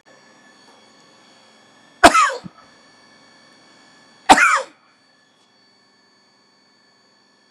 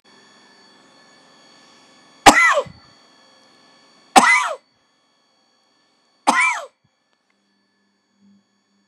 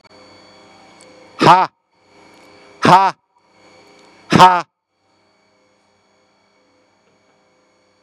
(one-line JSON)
{"cough_length": "7.5 s", "cough_amplitude": 32768, "cough_signal_mean_std_ratio": 0.23, "three_cough_length": "8.9 s", "three_cough_amplitude": 32768, "three_cough_signal_mean_std_ratio": 0.26, "exhalation_length": "8.0 s", "exhalation_amplitude": 32768, "exhalation_signal_mean_std_ratio": 0.26, "survey_phase": "beta (2021-08-13 to 2022-03-07)", "age": "45-64", "gender": "Male", "wearing_mask": "No", "symptom_none": true, "smoker_status": "Ex-smoker", "respiratory_condition_asthma": false, "respiratory_condition_other": false, "recruitment_source": "REACT", "submission_delay": "4 days", "covid_test_result": "Negative", "covid_test_method": "RT-qPCR", "influenza_a_test_result": "Negative", "influenza_b_test_result": "Negative"}